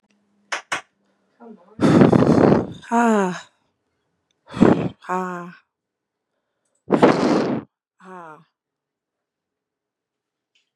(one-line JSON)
{"exhalation_length": "10.8 s", "exhalation_amplitude": 32767, "exhalation_signal_mean_std_ratio": 0.37, "survey_phase": "beta (2021-08-13 to 2022-03-07)", "age": "18-44", "gender": "Female", "wearing_mask": "No", "symptom_cough_any": true, "symptom_runny_or_blocked_nose": true, "symptom_sore_throat": true, "symptom_onset": "12 days", "smoker_status": "Never smoked", "respiratory_condition_asthma": false, "respiratory_condition_other": false, "recruitment_source": "REACT", "submission_delay": "2 days", "covid_test_result": "Negative", "covid_test_method": "RT-qPCR", "influenza_a_test_result": "Negative", "influenza_b_test_result": "Negative"}